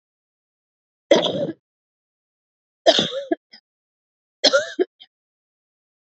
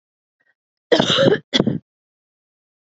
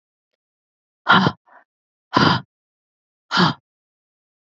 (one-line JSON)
{"three_cough_length": "6.1 s", "three_cough_amplitude": 29979, "three_cough_signal_mean_std_ratio": 0.29, "cough_length": "2.8 s", "cough_amplitude": 27877, "cough_signal_mean_std_ratio": 0.37, "exhalation_length": "4.5 s", "exhalation_amplitude": 28250, "exhalation_signal_mean_std_ratio": 0.3, "survey_phase": "beta (2021-08-13 to 2022-03-07)", "age": "45-64", "gender": "Female", "wearing_mask": "No", "symptom_cough_any": true, "symptom_runny_or_blocked_nose": true, "symptom_fatigue": true, "symptom_headache": true, "symptom_onset": "6 days", "smoker_status": "Never smoked", "respiratory_condition_asthma": false, "respiratory_condition_other": false, "recruitment_source": "Test and Trace", "submission_delay": "1 day", "covid_test_result": "Positive", "covid_test_method": "RT-qPCR", "covid_ct_value": 23.7, "covid_ct_gene": "ORF1ab gene", "covid_ct_mean": 23.9, "covid_viral_load": "14000 copies/ml", "covid_viral_load_category": "Low viral load (10K-1M copies/ml)"}